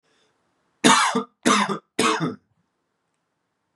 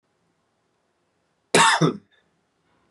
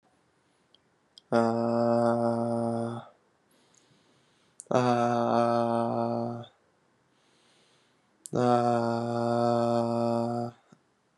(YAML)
three_cough_length: 3.8 s
three_cough_amplitude: 28714
three_cough_signal_mean_std_ratio: 0.4
cough_length: 2.9 s
cough_amplitude: 23650
cough_signal_mean_std_ratio: 0.29
exhalation_length: 11.2 s
exhalation_amplitude: 12614
exhalation_signal_mean_std_ratio: 0.58
survey_phase: beta (2021-08-13 to 2022-03-07)
age: 18-44
gender: Male
wearing_mask: 'No'
symptom_cough_any: true
symptom_runny_or_blocked_nose: true
symptom_shortness_of_breath: true
symptom_sore_throat: true
symptom_abdominal_pain: true
symptom_fatigue: true
symptom_fever_high_temperature: true
symptom_headache: true
symptom_onset: 3 days
smoker_status: Prefer not to say
respiratory_condition_asthma: false
respiratory_condition_other: false
recruitment_source: Test and Trace
submission_delay: 2 days
covid_test_result: Positive
covid_test_method: RT-qPCR
covid_ct_value: 21.0
covid_ct_gene: N gene